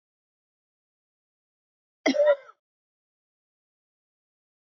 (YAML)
cough_length: 4.8 s
cough_amplitude: 10521
cough_signal_mean_std_ratio: 0.2
survey_phase: alpha (2021-03-01 to 2021-08-12)
age: 65+
gender: Female
wearing_mask: 'No'
symptom_none: true
smoker_status: Never smoked
respiratory_condition_asthma: false
respiratory_condition_other: false
recruitment_source: REACT
submission_delay: 2 days
covid_test_result: Negative
covid_test_method: RT-qPCR